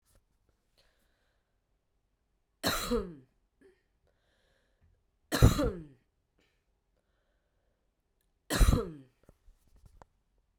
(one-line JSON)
{"three_cough_length": "10.6 s", "three_cough_amplitude": 13968, "three_cough_signal_mean_std_ratio": 0.23, "survey_phase": "beta (2021-08-13 to 2022-03-07)", "age": "18-44", "gender": "Female", "wearing_mask": "No", "symptom_cough_any": true, "symptom_runny_or_blocked_nose": true, "symptom_diarrhoea": true, "symptom_fatigue": true, "symptom_fever_high_temperature": true, "symptom_onset": "2 days", "smoker_status": "Never smoked", "respiratory_condition_asthma": false, "respiratory_condition_other": false, "recruitment_source": "Test and Trace", "submission_delay": "1 day", "covid_test_result": "Positive", "covid_test_method": "RT-qPCR", "covid_ct_value": 23.6, "covid_ct_gene": "ORF1ab gene", "covid_ct_mean": 24.4, "covid_viral_load": "10000 copies/ml", "covid_viral_load_category": "Low viral load (10K-1M copies/ml)"}